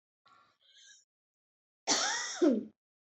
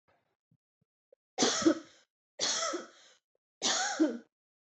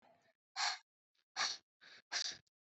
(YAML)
cough_length: 3.2 s
cough_amplitude: 8110
cough_signal_mean_std_ratio: 0.37
three_cough_length: 4.6 s
three_cough_amplitude: 7218
three_cough_signal_mean_std_ratio: 0.42
exhalation_length: 2.6 s
exhalation_amplitude: 1975
exhalation_signal_mean_std_ratio: 0.39
survey_phase: beta (2021-08-13 to 2022-03-07)
age: 18-44
gender: Female
wearing_mask: 'No'
symptom_none: true
smoker_status: Never smoked
respiratory_condition_asthma: false
respiratory_condition_other: false
recruitment_source: REACT
submission_delay: 2 days
covid_test_result: Negative
covid_test_method: RT-qPCR
influenza_a_test_result: Negative
influenza_b_test_result: Negative